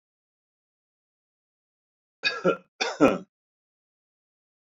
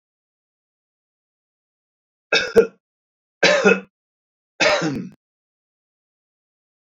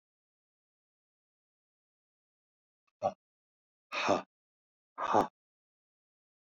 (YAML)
cough_length: 4.6 s
cough_amplitude: 18950
cough_signal_mean_std_ratio: 0.23
three_cough_length: 6.8 s
three_cough_amplitude: 28702
three_cough_signal_mean_std_ratio: 0.29
exhalation_length: 6.5 s
exhalation_amplitude: 7960
exhalation_signal_mean_std_ratio: 0.22
survey_phase: alpha (2021-03-01 to 2021-08-12)
age: 65+
gender: Male
wearing_mask: 'No'
symptom_none: true
smoker_status: Ex-smoker
respiratory_condition_asthma: false
respiratory_condition_other: false
recruitment_source: REACT
submission_delay: 2 days
covid_test_result: Negative
covid_test_method: RT-qPCR